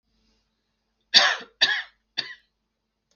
{
  "three_cough_length": "3.2 s",
  "three_cough_amplitude": 31020,
  "three_cough_signal_mean_std_ratio": 0.28,
  "survey_phase": "beta (2021-08-13 to 2022-03-07)",
  "age": "65+",
  "gender": "Male",
  "wearing_mask": "No",
  "symptom_none": true,
  "symptom_onset": "12 days",
  "smoker_status": "Ex-smoker",
  "respiratory_condition_asthma": false,
  "respiratory_condition_other": false,
  "recruitment_source": "REACT",
  "submission_delay": "2 days",
  "covid_test_result": "Negative",
  "covid_test_method": "RT-qPCR",
  "influenza_a_test_result": "Negative",
  "influenza_b_test_result": "Negative"
}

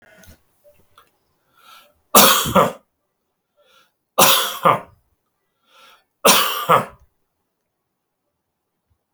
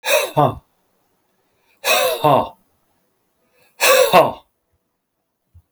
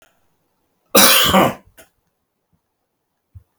{
  "three_cough_length": "9.1 s",
  "three_cough_amplitude": 32768,
  "three_cough_signal_mean_std_ratio": 0.31,
  "exhalation_length": "5.7 s",
  "exhalation_amplitude": 30994,
  "exhalation_signal_mean_std_ratio": 0.4,
  "cough_length": "3.6 s",
  "cough_amplitude": 32768,
  "cough_signal_mean_std_ratio": 0.33,
  "survey_phase": "beta (2021-08-13 to 2022-03-07)",
  "age": "65+",
  "gender": "Male",
  "wearing_mask": "No",
  "symptom_none": true,
  "smoker_status": "Never smoked",
  "respiratory_condition_asthma": true,
  "respiratory_condition_other": false,
  "recruitment_source": "REACT",
  "submission_delay": "3 days",
  "covid_test_result": "Negative",
  "covid_test_method": "RT-qPCR"
}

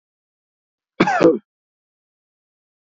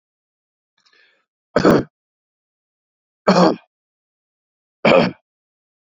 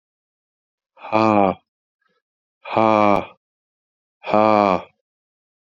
{
  "cough_length": "2.8 s",
  "cough_amplitude": 27673,
  "cough_signal_mean_std_ratio": 0.26,
  "three_cough_length": "5.9 s",
  "three_cough_amplitude": 31819,
  "three_cough_signal_mean_std_ratio": 0.28,
  "exhalation_length": "5.7 s",
  "exhalation_amplitude": 28346,
  "exhalation_signal_mean_std_ratio": 0.32,
  "survey_phase": "beta (2021-08-13 to 2022-03-07)",
  "age": "45-64",
  "gender": "Male",
  "wearing_mask": "No",
  "symptom_fever_high_temperature": true,
  "symptom_headache": true,
  "smoker_status": "Never smoked",
  "respiratory_condition_asthma": false,
  "respiratory_condition_other": false,
  "recruitment_source": "REACT",
  "submission_delay": "1 day",
  "covid_test_result": "Negative",
  "covid_test_method": "RT-qPCR",
  "influenza_a_test_result": "Unknown/Void",
  "influenza_b_test_result": "Unknown/Void"
}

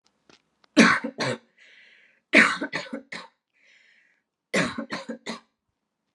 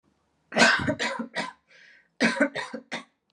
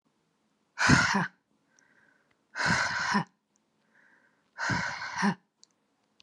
{
  "three_cough_length": "6.1 s",
  "three_cough_amplitude": 28570,
  "three_cough_signal_mean_std_ratio": 0.31,
  "cough_length": "3.3 s",
  "cough_amplitude": 18094,
  "cough_signal_mean_std_ratio": 0.45,
  "exhalation_length": "6.2 s",
  "exhalation_amplitude": 14918,
  "exhalation_signal_mean_std_ratio": 0.42,
  "survey_phase": "alpha (2021-03-01 to 2021-08-12)",
  "age": "18-44",
  "gender": "Female",
  "wearing_mask": "No",
  "symptom_abdominal_pain": true,
  "symptom_diarrhoea": true,
  "symptom_fatigue": true,
  "symptom_headache": true,
  "smoker_status": "Ex-smoker",
  "respiratory_condition_asthma": false,
  "respiratory_condition_other": false,
  "recruitment_source": "REACT",
  "submission_delay": "5 days",
  "covid_test_result": "Negative",
  "covid_test_method": "RT-qPCR"
}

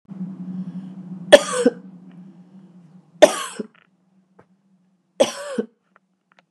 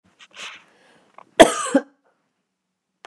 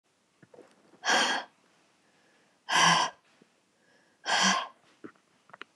{
  "three_cough_length": "6.5 s",
  "three_cough_amplitude": 32768,
  "three_cough_signal_mean_std_ratio": 0.26,
  "cough_length": "3.1 s",
  "cough_amplitude": 32768,
  "cough_signal_mean_std_ratio": 0.21,
  "exhalation_length": "5.8 s",
  "exhalation_amplitude": 10322,
  "exhalation_signal_mean_std_ratio": 0.37,
  "survey_phase": "beta (2021-08-13 to 2022-03-07)",
  "age": "45-64",
  "gender": "Female",
  "wearing_mask": "No",
  "symptom_cough_any": true,
  "symptom_sore_throat": true,
  "symptom_headache": true,
  "symptom_onset": "13 days",
  "smoker_status": "Never smoked",
  "respiratory_condition_asthma": false,
  "respiratory_condition_other": false,
  "recruitment_source": "REACT",
  "submission_delay": "1 day",
  "covid_test_result": "Negative",
  "covid_test_method": "RT-qPCR",
  "influenza_a_test_result": "Negative",
  "influenza_b_test_result": "Negative"
}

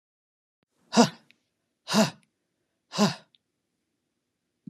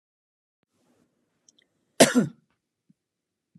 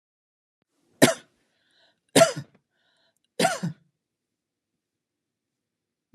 {
  "exhalation_length": "4.7 s",
  "exhalation_amplitude": 22878,
  "exhalation_signal_mean_std_ratio": 0.24,
  "cough_length": "3.6 s",
  "cough_amplitude": 28162,
  "cough_signal_mean_std_ratio": 0.18,
  "three_cough_length": "6.1 s",
  "three_cough_amplitude": 31145,
  "three_cough_signal_mean_std_ratio": 0.21,
  "survey_phase": "beta (2021-08-13 to 2022-03-07)",
  "age": "45-64",
  "gender": "Female",
  "wearing_mask": "No",
  "symptom_none": true,
  "smoker_status": "Never smoked",
  "respiratory_condition_asthma": false,
  "respiratory_condition_other": false,
  "recruitment_source": "REACT",
  "submission_delay": "2 days",
  "covid_test_result": "Negative",
  "covid_test_method": "RT-qPCR",
  "influenza_a_test_result": "Unknown/Void",
  "influenza_b_test_result": "Unknown/Void"
}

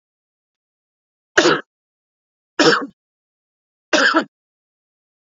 {
  "three_cough_length": "5.3 s",
  "three_cough_amplitude": 29620,
  "three_cough_signal_mean_std_ratio": 0.29,
  "survey_phase": "alpha (2021-03-01 to 2021-08-12)",
  "age": "45-64",
  "gender": "Male",
  "wearing_mask": "No",
  "symptom_none": true,
  "smoker_status": "Ex-smoker",
  "respiratory_condition_asthma": false,
  "respiratory_condition_other": false,
  "recruitment_source": "REACT",
  "submission_delay": "1 day",
  "covid_test_result": "Negative",
  "covid_test_method": "RT-qPCR"
}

